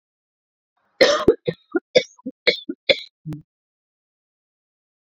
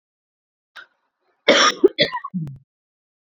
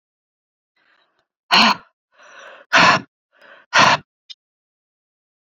{"three_cough_length": "5.1 s", "three_cough_amplitude": 28503, "three_cough_signal_mean_std_ratio": 0.26, "cough_length": "3.3 s", "cough_amplitude": 29590, "cough_signal_mean_std_ratio": 0.31, "exhalation_length": "5.5 s", "exhalation_amplitude": 30236, "exhalation_signal_mean_std_ratio": 0.3, "survey_phase": "beta (2021-08-13 to 2022-03-07)", "age": "45-64", "gender": "Female", "wearing_mask": "No", "symptom_none": true, "smoker_status": "Never smoked", "respiratory_condition_asthma": true, "respiratory_condition_other": false, "recruitment_source": "Test and Trace", "submission_delay": "1 day", "covid_test_result": "Negative", "covid_test_method": "RT-qPCR"}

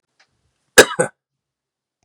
{"cough_length": "2.0 s", "cough_amplitude": 32768, "cough_signal_mean_std_ratio": 0.19, "survey_phase": "beta (2021-08-13 to 2022-03-07)", "age": "18-44", "gender": "Male", "wearing_mask": "No", "symptom_runny_or_blocked_nose": true, "smoker_status": "Never smoked", "respiratory_condition_asthma": true, "respiratory_condition_other": false, "recruitment_source": "Test and Trace", "submission_delay": "2 days", "covid_test_result": "Positive", "covid_test_method": "RT-qPCR", "covid_ct_value": 29.6, "covid_ct_gene": "ORF1ab gene"}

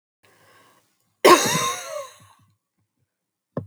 {"cough_length": "3.7 s", "cough_amplitude": 30055, "cough_signal_mean_std_ratio": 0.28, "survey_phase": "alpha (2021-03-01 to 2021-08-12)", "age": "18-44", "gender": "Female", "wearing_mask": "No", "symptom_none": true, "symptom_onset": "11 days", "smoker_status": "Never smoked", "respiratory_condition_asthma": false, "respiratory_condition_other": false, "recruitment_source": "REACT", "submission_delay": "2 days", "covid_test_result": "Negative", "covid_test_method": "RT-qPCR"}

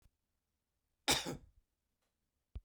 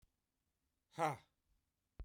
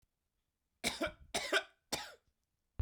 {"cough_length": "2.6 s", "cough_amplitude": 5000, "cough_signal_mean_std_ratio": 0.24, "exhalation_length": "2.0 s", "exhalation_amplitude": 2055, "exhalation_signal_mean_std_ratio": 0.25, "three_cough_length": "2.8 s", "three_cough_amplitude": 3523, "three_cough_signal_mean_std_ratio": 0.36, "survey_phase": "beta (2021-08-13 to 2022-03-07)", "age": "45-64", "gender": "Male", "wearing_mask": "No", "symptom_none": true, "smoker_status": "Ex-smoker", "respiratory_condition_asthma": false, "respiratory_condition_other": false, "recruitment_source": "REACT", "submission_delay": "2 days", "covid_test_result": "Negative", "covid_test_method": "RT-qPCR"}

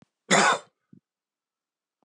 {"cough_length": "2.0 s", "cough_amplitude": 17848, "cough_signal_mean_std_ratio": 0.29, "survey_phase": "beta (2021-08-13 to 2022-03-07)", "age": "45-64", "gender": "Male", "wearing_mask": "No", "symptom_headache": true, "symptom_change_to_sense_of_smell_or_taste": true, "symptom_loss_of_taste": true, "symptom_other": true, "symptom_onset": "4 days", "smoker_status": "Ex-smoker", "respiratory_condition_asthma": false, "respiratory_condition_other": false, "recruitment_source": "Test and Trace", "submission_delay": "2 days", "covid_test_result": "Positive", "covid_test_method": "ePCR"}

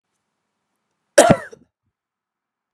{"cough_length": "2.7 s", "cough_amplitude": 32768, "cough_signal_mean_std_ratio": 0.2, "survey_phase": "beta (2021-08-13 to 2022-03-07)", "age": "18-44", "gender": "Female", "wearing_mask": "No", "symptom_runny_or_blocked_nose": true, "symptom_onset": "3 days", "smoker_status": "Ex-smoker", "respiratory_condition_asthma": false, "respiratory_condition_other": false, "recruitment_source": "REACT", "submission_delay": "3 days", "covid_test_result": "Negative", "covid_test_method": "RT-qPCR", "influenza_a_test_result": "Unknown/Void", "influenza_b_test_result": "Unknown/Void"}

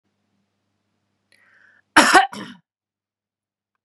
{"cough_length": "3.8 s", "cough_amplitude": 32768, "cough_signal_mean_std_ratio": 0.22, "survey_phase": "beta (2021-08-13 to 2022-03-07)", "age": "18-44", "gender": "Female", "wearing_mask": "No", "symptom_none": true, "smoker_status": "Never smoked", "respiratory_condition_asthma": false, "respiratory_condition_other": false, "recruitment_source": "REACT", "submission_delay": "2 days", "covid_test_result": "Negative", "covid_test_method": "RT-qPCR", "influenza_a_test_result": "Negative", "influenza_b_test_result": "Negative"}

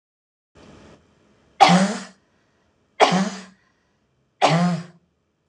{"three_cough_length": "5.5 s", "three_cough_amplitude": 26028, "three_cough_signal_mean_std_ratio": 0.35, "survey_phase": "alpha (2021-03-01 to 2021-08-12)", "age": "45-64", "gender": "Female", "wearing_mask": "No", "symptom_none": true, "smoker_status": "Ex-smoker", "respiratory_condition_asthma": false, "respiratory_condition_other": false, "recruitment_source": "REACT", "submission_delay": "1 day", "covid_test_result": "Negative", "covid_test_method": "RT-qPCR"}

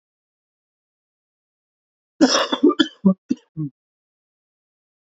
{"cough_length": "5.0 s", "cough_amplitude": 27666, "cough_signal_mean_std_ratio": 0.28, "survey_phase": "beta (2021-08-13 to 2022-03-07)", "age": "18-44", "gender": "Male", "wearing_mask": "No", "symptom_cough_any": true, "symptom_runny_or_blocked_nose": true, "symptom_diarrhoea": true, "symptom_fatigue": true, "symptom_headache": true, "symptom_onset": "5 days", "smoker_status": "Ex-smoker", "respiratory_condition_asthma": false, "respiratory_condition_other": false, "recruitment_source": "Test and Trace", "submission_delay": "2 days", "covid_test_result": "Positive", "covid_test_method": "RT-qPCR", "covid_ct_value": 12.2, "covid_ct_gene": "N gene", "covid_ct_mean": 12.5, "covid_viral_load": "79000000 copies/ml", "covid_viral_load_category": "High viral load (>1M copies/ml)"}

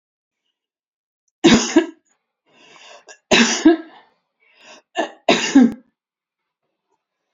{"three_cough_length": "7.3 s", "three_cough_amplitude": 32768, "three_cough_signal_mean_std_ratio": 0.32, "survey_phase": "alpha (2021-03-01 to 2021-08-12)", "age": "65+", "gender": "Female", "wearing_mask": "No", "symptom_none": true, "smoker_status": "Never smoked", "respiratory_condition_asthma": false, "respiratory_condition_other": false, "recruitment_source": "REACT", "submission_delay": "5 days", "covid_test_result": "Negative", "covid_test_method": "RT-qPCR"}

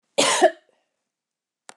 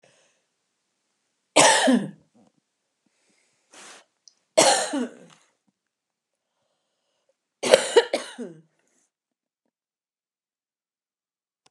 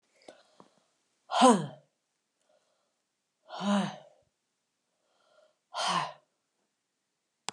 {"cough_length": "1.8 s", "cough_amplitude": 20510, "cough_signal_mean_std_ratio": 0.33, "three_cough_length": "11.7 s", "three_cough_amplitude": 32768, "three_cough_signal_mean_std_ratio": 0.25, "exhalation_length": "7.5 s", "exhalation_amplitude": 12116, "exhalation_signal_mean_std_ratio": 0.26, "survey_phase": "beta (2021-08-13 to 2022-03-07)", "age": "65+", "gender": "Female", "wearing_mask": "No", "symptom_cough_any": true, "symptom_runny_or_blocked_nose": true, "symptom_fatigue": true, "smoker_status": "Never smoked", "respiratory_condition_asthma": false, "respiratory_condition_other": false, "recruitment_source": "Test and Trace", "submission_delay": "-1 day", "covid_test_result": "Positive", "covid_test_method": "LFT"}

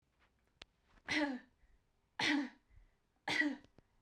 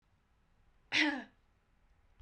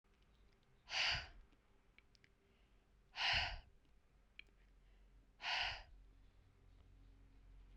{"three_cough_length": "4.0 s", "three_cough_amplitude": 2663, "three_cough_signal_mean_std_ratio": 0.41, "cough_length": "2.2 s", "cough_amplitude": 4802, "cough_signal_mean_std_ratio": 0.3, "exhalation_length": "7.8 s", "exhalation_amplitude": 1850, "exhalation_signal_mean_std_ratio": 0.38, "survey_phase": "beta (2021-08-13 to 2022-03-07)", "age": "18-44", "gender": "Female", "wearing_mask": "No", "symptom_runny_or_blocked_nose": true, "smoker_status": "Never smoked", "respiratory_condition_asthma": false, "respiratory_condition_other": false, "recruitment_source": "REACT", "submission_delay": "1 day", "covid_test_result": "Negative", "covid_test_method": "RT-qPCR"}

